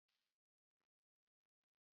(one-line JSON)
{"cough_length": "2.0 s", "cough_amplitude": 8, "cough_signal_mean_std_ratio": 0.17, "survey_phase": "beta (2021-08-13 to 2022-03-07)", "age": "65+", "gender": "Female", "wearing_mask": "No", "symptom_cough_any": true, "symptom_fatigue": true, "symptom_headache": true, "smoker_status": "Never smoked", "respiratory_condition_asthma": false, "respiratory_condition_other": false, "recruitment_source": "Test and Trace", "submission_delay": "2 days", "covid_test_result": "Positive", "covid_test_method": "RT-qPCR", "covid_ct_value": 27.5, "covid_ct_gene": "ORF1ab gene"}